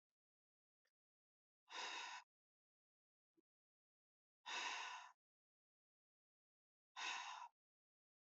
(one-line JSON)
{"exhalation_length": "8.3 s", "exhalation_amplitude": 595, "exhalation_signal_mean_std_ratio": 0.35, "survey_phase": "beta (2021-08-13 to 2022-03-07)", "age": "45-64", "gender": "Female", "wearing_mask": "No", "symptom_none": true, "smoker_status": "Never smoked", "respiratory_condition_asthma": false, "respiratory_condition_other": false, "recruitment_source": "REACT", "submission_delay": "2 days", "covid_test_result": "Negative", "covid_test_method": "RT-qPCR"}